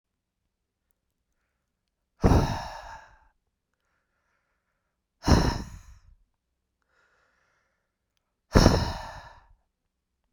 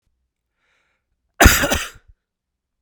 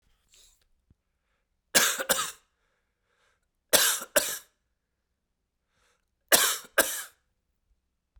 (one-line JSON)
{"exhalation_length": "10.3 s", "exhalation_amplitude": 32768, "exhalation_signal_mean_std_ratio": 0.25, "cough_length": "2.8 s", "cough_amplitude": 32768, "cough_signal_mean_std_ratio": 0.26, "three_cough_length": "8.2 s", "three_cough_amplitude": 28559, "three_cough_signal_mean_std_ratio": 0.29, "survey_phase": "beta (2021-08-13 to 2022-03-07)", "age": "18-44", "gender": "Male", "wearing_mask": "No", "symptom_runny_or_blocked_nose": true, "symptom_sore_throat": true, "symptom_headache": true, "symptom_change_to_sense_of_smell_or_taste": true, "symptom_loss_of_taste": true, "smoker_status": "Ex-smoker", "respiratory_condition_asthma": false, "respiratory_condition_other": false, "recruitment_source": "Test and Trace", "submission_delay": "2 days", "covid_test_result": "Positive", "covid_test_method": "RT-qPCR", "covid_ct_value": 26.4, "covid_ct_gene": "ORF1ab gene", "covid_ct_mean": 26.9, "covid_viral_load": "1500 copies/ml", "covid_viral_load_category": "Minimal viral load (< 10K copies/ml)"}